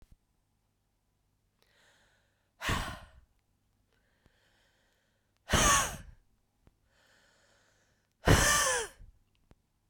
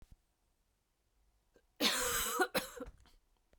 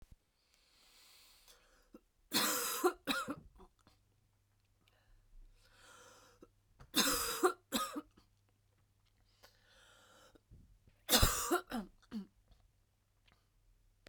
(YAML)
exhalation_length: 9.9 s
exhalation_amplitude: 12543
exhalation_signal_mean_std_ratio: 0.28
cough_length: 3.6 s
cough_amplitude: 4290
cough_signal_mean_std_ratio: 0.4
three_cough_length: 14.1 s
three_cough_amplitude: 6451
three_cough_signal_mean_std_ratio: 0.33
survey_phase: beta (2021-08-13 to 2022-03-07)
age: 45-64
gender: Female
wearing_mask: 'No'
symptom_cough_any: true
symptom_runny_or_blocked_nose: true
symptom_fatigue: true
symptom_fever_high_temperature: true
symptom_headache: true
symptom_change_to_sense_of_smell_or_taste: true
symptom_loss_of_taste: true
smoker_status: Never smoked
respiratory_condition_asthma: false
respiratory_condition_other: false
recruitment_source: Test and Trace
submission_delay: 2 days
covid_test_result: Positive
covid_test_method: RT-qPCR